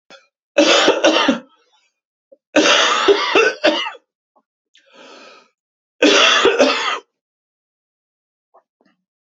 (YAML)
three_cough_length: 9.2 s
three_cough_amplitude: 31753
three_cough_signal_mean_std_ratio: 0.47
survey_phase: beta (2021-08-13 to 2022-03-07)
age: 45-64
gender: Male
wearing_mask: 'No'
symptom_cough_any: true
symptom_runny_or_blocked_nose: true
symptom_sore_throat: true
symptom_onset: 2 days
smoker_status: Never smoked
respiratory_condition_asthma: false
respiratory_condition_other: false
recruitment_source: Test and Trace
submission_delay: 1 day
covid_test_result: Positive
covid_test_method: RT-qPCR
covid_ct_value: 13.8
covid_ct_gene: ORF1ab gene